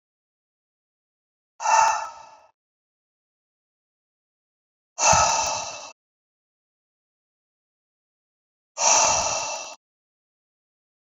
{"exhalation_length": "11.2 s", "exhalation_amplitude": 22284, "exhalation_signal_mean_std_ratio": 0.33, "survey_phase": "beta (2021-08-13 to 2022-03-07)", "age": "45-64", "gender": "Male", "wearing_mask": "No", "symptom_cough_any": true, "symptom_runny_or_blocked_nose": true, "symptom_shortness_of_breath": true, "symptom_sore_throat": true, "symptom_fever_high_temperature": true, "symptom_headache": true, "symptom_onset": "3 days", "smoker_status": "Never smoked", "respiratory_condition_asthma": true, "respiratory_condition_other": false, "recruitment_source": "Test and Trace", "submission_delay": "1 day", "covid_test_result": "Positive", "covid_test_method": "RT-qPCR", "covid_ct_value": 21.8, "covid_ct_gene": "ORF1ab gene"}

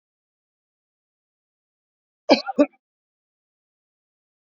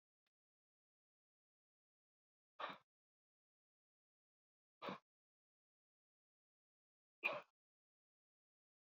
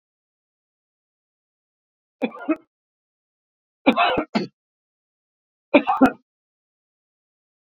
{"cough_length": "4.4 s", "cough_amplitude": 27821, "cough_signal_mean_std_ratio": 0.15, "exhalation_length": "9.0 s", "exhalation_amplitude": 1525, "exhalation_signal_mean_std_ratio": 0.16, "three_cough_length": "7.8 s", "three_cough_amplitude": 27523, "three_cough_signal_mean_std_ratio": 0.24, "survey_phase": "beta (2021-08-13 to 2022-03-07)", "age": "65+", "gender": "Male", "wearing_mask": "No", "symptom_none": true, "smoker_status": "Never smoked", "respiratory_condition_asthma": false, "respiratory_condition_other": false, "recruitment_source": "REACT", "submission_delay": "7 days", "covid_test_result": "Negative", "covid_test_method": "RT-qPCR"}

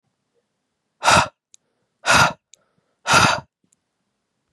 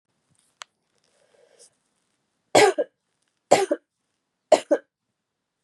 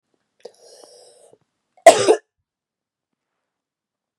{"exhalation_length": "4.5 s", "exhalation_amplitude": 31528, "exhalation_signal_mean_std_ratio": 0.33, "three_cough_length": "5.6 s", "three_cough_amplitude": 31722, "three_cough_signal_mean_std_ratio": 0.23, "cough_length": "4.2 s", "cough_amplitude": 32768, "cough_signal_mean_std_ratio": 0.18, "survey_phase": "beta (2021-08-13 to 2022-03-07)", "age": "18-44", "gender": "Female", "wearing_mask": "No", "symptom_cough_any": true, "symptom_new_continuous_cough": true, "symptom_sore_throat": true, "smoker_status": "Never smoked", "respiratory_condition_asthma": false, "respiratory_condition_other": false, "recruitment_source": "Test and Trace", "submission_delay": "1 day", "covid_test_result": "Positive", "covid_test_method": "RT-qPCR", "covid_ct_value": 22.8, "covid_ct_gene": "N gene"}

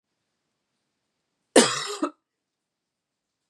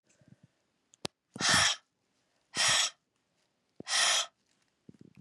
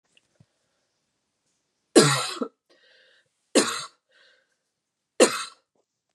{"cough_length": "3.5 s", "cough_amplitude": 30981, "cough_signal_mean_std_ratio": 0.21, "exhalation_length": "5.2 s", "exhalation_amplitude": 8088, "exhalation_signal_mean_std_ratio": 0.38, "three_cough_length": "6.1 s", "three_cough_amplitude": 29085, "three_cough_signal_mean_std_ratio": 0.25, "survey_phase": "beta (2021-08-13 to 2022-03-07)", "age": "18-44", "gender": "Female", "wearing_mask": "No", "symptom_cough_any": true, "symptom_sore_throat": true, "symptom_fatigue": true, "symptom_headache": true, "symptom_change_to_sense_of_smell_or_taste": true, "symptom_loss_of_taste": true, "symptom_onset": "3 days", "smoker_status": "Ex-smoker", "respiratory_condition_asthma": false, "respiratory_condition_other": false, "recruitment_source": "Test and Trace", "submission_delay": "2 days", "covid_test_result": "Positive", "covid_test_method": "RT-qPCR", "covid_ct_value": 21.8, "covid_ct_gene": "N gene"}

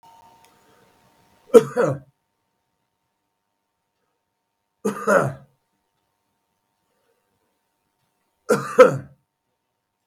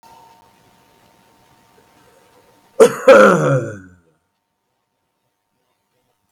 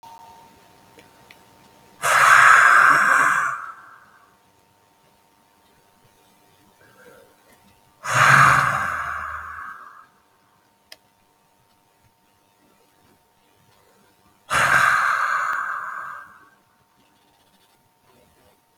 {"three_cough_length": "10.1 s", "three_cough_amplitude": 32655, "three_cough_signal_mean_std_ratio": 0.21, "cough_length": "6.3 s", "cough_amplitude": 32655, "cough_signal_mean_std_ratio": 0.27, "exhalation_length": "18.8 s", "exhalation_amplitude": 32653, "exhalation_signal_mean_std_ratio": 0.37, "survey_phase": "beta (2021-08-13 to 2022-03-07)", "age": "65+", "gender": "Male", "wearing_mask": "No", "symptom_none": true, "smoker_status": "Ex-smoker", "respiratory_condition_asthma": true, "respiratory_condition_other": false, "recruitment_source": "REACT", "submission_delay": "1 day", "covid_test_result": "Negative", "covid_test_method": "RT-qPCR", "influenza_a_test_result": "Unknown/Void", "influenza_b_test_result": "Unknown/Void"}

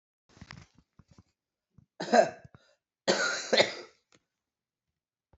{"cough_length": "5.4 s", "cough_amplitude": 13187, "cough_signal_mean_std_ratio": 0.28, "survey_phase": "beta (2021-08-13 to 2022-03-07)", "age": "45-64", "gender": "Female", "wearing_mask": "No", "symptom_cough_any": true, "symptom_sore_throat": true, "symptom_onset": "27 days", "smoker_status": "Ex-smoker", "respiratory_condition_asthma": false, "respiratory_condition_other": false, "recruitment_source": "Test and Trace", "submission_delay": "24 days", "covid_test_result": "Negative", "covid_test_method": "RT-qPCR"}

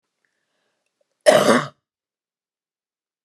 {"cough_length": "3.2 s", "cough_amplitude": 29204, "cough_signal_mean_std_ratio": 0.25, "survey_phase": "beta (2021-08-13 to 2022-03-07)", "age": "65+", "gender": "Female", "wearing_mask": "No", "symptom_none": true, "smoker_status": "Ex-smoker", "respiratory_condition_asthma": false, "respiratory_condition_other": false, "recruitment_source": "REACT", "submission_delay": "1 day", "covid_test_result": "Negative", "covid_test_method": "RT-qPCR"}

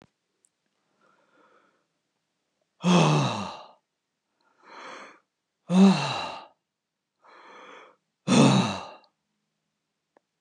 {"three_cough_length": "10.4 s", "three_cough_amplitude": 15933, "three_cough_signal_mean_std_ratio": 0.32, "survey_phase": "beta (2021-08-13 to 2022-03-07)", "age": "65+", "gender": "Male", "wearing_mask": "No", "symptom_none": true, "smoker_status": "Ex-smoker", "respiratory_condition_asthma": false, "respiratory_condition_other": false, "recruitment_source": "REACT", "submission_delay": "2 days", "covid_test_result": "Negative", "covid_test_method": "RT-qPCR"}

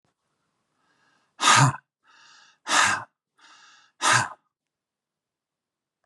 {"exhalation_length": "6.1 s", "exhalation_amplitude": 18159, "exhalation_signal_mean_std_ratio": 0.3, "survey_phase": "beta (2021-08-13 to 2022-03-07)", "age": "45-64", "gender": "Male", "wearing_mask": "No", "symptom_none": true, "smoker_status": "Ex-smoker", "respiratory_condition_asthma": true, "respiratory_condition_other": false, "recruitment_source": "REACT", "submission_delay": "3 days", "covid_test_result": "Negative", "covid_test_method": "RT-qPCR", "influenza_a_test_result": "Negative", "influenza_b_test_result": "Negative"}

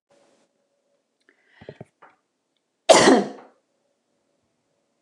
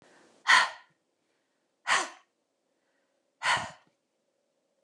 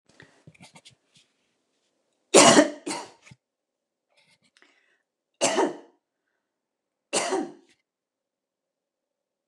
{"cough_length": "5.0 s", "cough_amplitude": 29203, "cough_signal_mean_std_ratio": 0.21, "exhalation_length": "4.8 s", "exhalation_amplitude": 13254, "exhalation_signal_mean_std_ratio": 0.27, "three_cough_length": "9.5 s", "three_cough_amplitude": 29203, "three_cough_signal_mean_std_ratio": 0.23, "survey_phase": "alpha (2021-03-01 to 2021-08-12)", "age": "45-64", "gender": "Female", "wearing_mask": "No", "symptom_none": true, "smoker_status": "Ex-smoker", "respiratory_condition_asthma": false, "respiratory_condition_other": false, "recruitment_source": "REACT", "submission_delay": "3 days", "covid_test_result": "Negative", "covid_test_method": "RT-qPCR"}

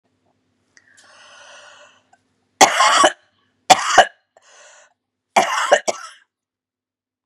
{"three_cough_length": "7.3 s", "three_cough_amplitude": 32768, "three_cough_signal_mean_std_ratio": 0.3, "survey_phase": "beta (2021-08-13 to 2022-03-07)", "age": "65+", "gender": "Female", "wearing_mask": "No", "symptom_cough_any": true, "symptom_new_continuous_cough": true, "symptom_sore_throat": true, "symptom_headache": true, "symptom_onset": "2 days", "smoker_status": "Ex-smoker", "respiratory_condition_asthma": false, "respiratory_condition_other": false, "recruitment_source": "Test and Trace", "submission_delay": "1 day", "covid_test_result": "Positive", "covid_test_method": "ePCR"}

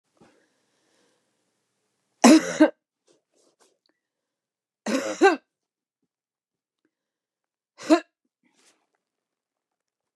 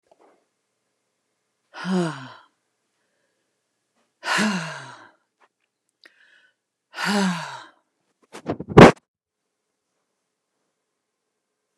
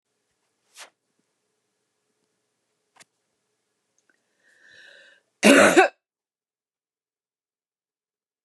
{"three_cough_length": "10.2 s", "three_cough_amplitude": 27281, "three_cough_signal_mean_std_ratio": 0.2, "exhalation_length": "11.8 s", "exhalation_amplitude": 29204, "exhalation_signal_mean_std_ratio": 0.2, "cough_length": "8.4 s", "cough_amplitude": 28285, "cough_signal_mean_std_ratio": 0.18, "survey_phase": "beta (2021-08-13 to 2022-03-07)", "age": "65+", "gender": "Female", "wearing_mask": "No", "symptom_none": true, "smoker_status": "Ex-smoker", "respiratory_condition_asthma": false, "respiratory_condition_other": false, "recruitment_source": "REACT", "submission_delay": "1 day", "covid_test_result": "Negative", "covid_test_method": "RT-qPCR", "influenza_a_test_result": "Negative", "influenza_b_test_result": "Negative"}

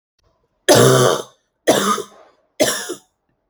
{"cough_length": "3.5 s", "cough_amplitude": 31016, "cough_signal_mean_std_ratio": 0.45, "survey_phase": "alpha (2021-03-01 to 2021-08-12)", "age": "18-44", "gender": "Female", "wearing_mask": "Yes", "symptom_none": true, "smoker_status": "Never smoked", "respiratory_condition_asthma": false, "respiratory_condition_other": false, "recruitment_source": "REACT", "submission_delay": "1 day", "covid_test_result": "Negative", "covid_test_method": "RT-qPCR"}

